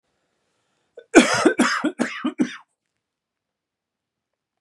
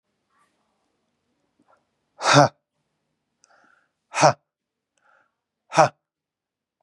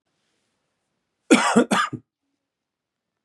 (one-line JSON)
{"three_cough_length": "4.6 s", "three_cough_amplitude": 32767, "three_cough_signal_mean_std_ratio": 0.32, "exhalation_length": "6.8 s", "exhalation_amplitude": 31849, "exhalation_signal_mean_std_ratio": 0.2, "cough_length": "3.2 s", "cough_amplitude": 28786, "cough_signal_mean_std_ratio": 0.3, "survey_phase": "beta (2021-08-13 to 2022-03-07)", "age": "45-64", "gender": "Male", "wearing_mask": "No", "symptom_cough_any": true, "smoker_status": "Never smoked", "respiratory_condition_asthma": false, "respiratory_condition_other": false, "recruitment_source": "REACT", "submission_delay": "1 day", "covid_test_result": "Negative", "covid_test_method": "RT-qPCR", "influenza_a_test_result": "Negative", "influenza_b_test_result": "Negative"}